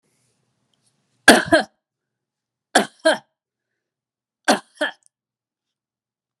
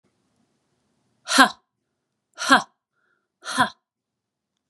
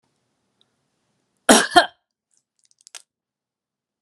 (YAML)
three_cough_length: 6.4 s
three_cough_amplitude: 32768
three_cough_signal_mean_std_ratio: 0.22
exhalation_length: 4.7 s
exhalation_amplitude: 32767
exhalation_signal_mean_std_ratio: 0.23
cough_length: 4.0 s
cough_amplitude: 32767
cough_signal_mean_std_ratio: 0.19
survey_phase: beta (2021-08-13 to 2022-03-07)
age: 45-64
gender: Female
wearing_mask: 'No'
symptom_none: true
smoker_status: Ex-smoker
respiratory_condition_asthma: false
respiratory_condition_other: false
recruitment_source: REACT
submission_delay: 1 day
covid_test_result: Negative
covid_test_method: RT-qPCR